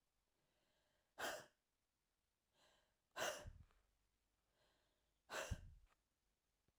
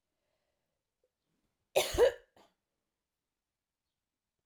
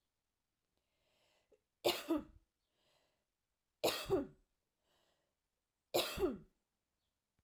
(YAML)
exhalation_length: 6.8 s
exhalation_amplitude: 872
exhalation_signal_mean_std_ratio: 0.3
cough_length: 4.5 s
cough_amplitude: 6287
cough_signal_mean_std_ratio: 0.2
three_cough_length: 7.4 s
three_cough_amplitude: 2846
three_cough_signal_mean_std_ratio: 0.3
survey_phase: alpha (2021-03-01 to 2021-08-12)
age: 45-64
gender: Female
wearing_mask: 'No'
symptom_none: true
smoker_status: Never smoked
respiratory_condition_asthma: false
respiratory_condition_other: false
recruitment_source: REACT
submission_delay: 10 days
covid_test_result: Negative
covid_test_method: RT-qPCR